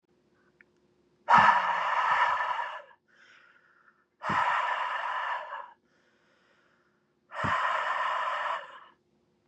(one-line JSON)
{"exhalation_length": "9.5 s", "exhalation_amplitude": 13819, "exhalation_signal_mean_std_ratio": 0.52, "survey_phase": "beta (2021-08-13 to 2022-03-07)", "age": "18-44", "gender": "Male", "wearing_mask": "No", "symptom_none": true, "smoker_status": "Never smoked", "respiratory_condition_asthma": false, "respiratory_condition_other": false, "recruitment_source": "REACT", "submission_delay": "1 day", "covid_test_result": "Negative", "covid_test_method": "RT-qPCR"}